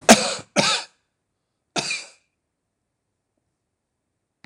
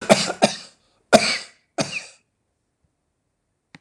three_cough_length: 4.5 s
three_cough_amplitude: 26028
three_cough_signal_mean_std_ratio: 0.25
cough_length: 3.8 s
cough_amplitude: 26028
cough_signal_mean_std_ratio: 0.29
survey_phase: beta (2021-08-13 to 2022-03-07)
age: 65+
gender: Male
wearing_mask: 'No'
symptom_runny_or_blocked_nose: true
smoker_status: Ex-smoker
respiratory_condition_asthma: false
respiratory_condition_other: false
recruitment_source: REACT
submission_delay: 1 day
covid_test_result: Negative
covid_test_method: RT-qPCR
influenza_a_test_result: Negative
influenza_b_test_result: Negative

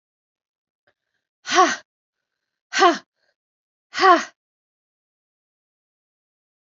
exhalation_length: 6.7 s
exhalation_amplitude: 26908
exhalation_signal_mean_std_ratio: 0.24
survey_phase: beta (2021-08-13 to 2022-03-07)
age: 45-64
gender: Female
wearing_mask: 'No'
symptom_cough_any: true
symptom_runny_or_blocked_nose: true
symptom_shortness_of_breath: true
symptom_sore_throat: true
symptom_fatigue: true
symptom_headache: true
symptom_onset: 4 days
smoker_status: Never smoked
respiratory_condition_asthma: false
respiratory_condition_other: false
recruitment_source: Test and Trace
submission_delay: 2 days
covid_test_result: Positive
covid_test_method: RT-qPCR
covid_ct_value: 15.9
covid_ct_gene: ORF1ab gene
covid_ct_mean: 16.5
covid_viral_load: 4000000 copies/ml
covid_viral_load_category: High viral load (>1M copies/ml)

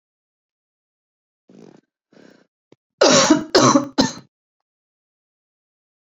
cough_length: 6.1 s
cough_amplitude: 32767
cough_signal_mean_std_ratio: 0.29
survey_phase: beta (2021-08-13 to 2022-03-07)
age: 18-44
gender: Female
wearing_mask: 'No'
symptom_cough_any: true
symptom_new_continuous_cough: true
symptom_runny_or_blocked_nose: true
symptom_fatigue: true
symptom_fever_high_temperature: true
symptom_headache: true
symptom_change_to_sense_of_smell_or_taste: true
smoker_status: Never smoked
respiratory_condition_asthma: false
respiratory_condition_other: false
recruitment_source: Test and Trace
submission_delay: 2 days
covid_test_result: Positive
covid_test_method: RT-qPCR
covid_ct_value: 18.9
covid_ct_gene: N gene
covid_ct_mean: 20.0
covid_viral_load: 280000 copies/ml
covid_viral_load_category: Low viral load (10K-1M copies/ml)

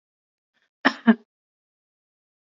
cough_length: 2.5 s
cough_amplitude: 22826
cough_signal_mean_std_ratio: 0.18
survey_phase: beta (2021-08-13 to 2022-03-07)
age: 18-44
gender: Female
wearing_mask: 'No'
symptom_change_to_sense_of_smell_or_taste: true
smoker_status: Ex-smoker
respiratory_condition_asthma: false
respiratory_condition_other: false
recruitment_source: REACT
submission_delay: 2 days
covid_test_result: Negative
covid_test_method: RT-qPCR
influenza_a_test_result: Negative
influenza_b_test_result: Negative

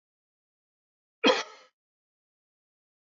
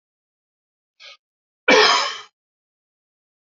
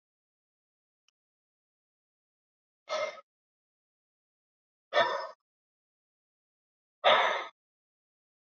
three_cough_length: 3.2 s
three_cough_amplitude: 12267
three_cough_signal_mean_std_ratio: 0.18
cough_length: 3.6 s
cough_amplitude: 28420
cough_signal_mean_std_ratio: 0.28
exhalation_length: 8.4 s
exhalation_amplitude: 10305
exhalation_signal_mean_std_ratio: 0.24
survey_phase: alpha (2021-03-01 to 2021-08-12)
age: 65+
gender: Male
wearing_mask: 'No'
symptom_none: true
smoker_status: Ex-smoker
respiratory_condition_asthma: false
respiratory_condition_other: false
recruitment_source: REACT
submission_delay: 1 day
covid_test_result: Negative
covid_test_method: RT-qPCR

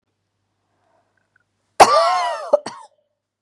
cough_length: 3.4 s
cough_amplitude: 32768
cough_signal_mean_std_ratio: 0.31
survey_phase: beta (2021-08-13 to 2022-03-07)
age: 45-64
gender: Female
wearing_mask: 'No'
symptom_none: true
smoker_status: Never smoked
respiratory_condition_asthma: false
respiratory_condition_other: false
recruitment_source: REACT
submission_delay: 1 day
covid_test_result: Negative
covid_test_method: RT-qPCR
influenza_a_test_result: Unknown/Void
influenza_b_test_result: Unknown/Void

